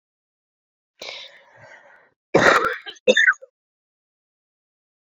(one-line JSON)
{"cough_length": "5.0 s", "cough_amplitude": 27703, "cough_signal_mean_std_ratio": 0.29, "survey_phase": "beta (2021-08-13 to 2022-03-07)", "age": "18-44", "gender": "Female", "wearing_mask": "No", "symptom_cough_any": true, "symptom_runny_or_blocked_nose": true, "symptom_sore_throat": true, "symptom_fatigue": true, "symptom_headache": true, "symptom_change_to_sense_of_smell_or_taste": true, "smoker_status": "Ex-smoker", "respiratory_condition_asthma": false, "respiratory_condition_other": false, "recruitment_source": "Test and Trace", "submission_delay": "2 days", "covid_test_result": "Positive", "covid_test_method": "LFT"}